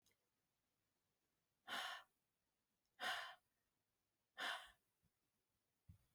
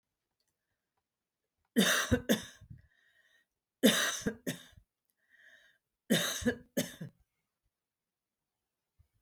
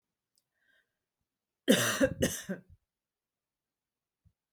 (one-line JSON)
{"exhalation_length": "6.1 s", "exhalation_amplitude": 747, "exhalation_signal_mean_std_ratio": 0.32, "three_cough_length": "9.2 s", "three_cough_amplitude": 9721, "three_cough_signal_mean_std_ratio": 0.31, "cough_length": "4.5 s", "cough_amplitude": 10396, "cough_signal_mean_std_ratio": 0.28, "survey_phase": "beta (2021-08-13 to 2022-03-07)", "age": "65+", "gender": "Female", "wearing_mask": "No", "symptom_fatigue": true, "symptom_onset": "12 days", "smoker_status": "Never smoked", "respiratory_condition_asthma": false, "respiratory_condition_other": false, "recruitment_source": "REACT", "submission_delay": "0 days", "covid_test_result": "Negative", "covid_test_method": "RT-qPCR", "influenza_a_test_result": "Negative", "influenza_b_test_result": "Negative"}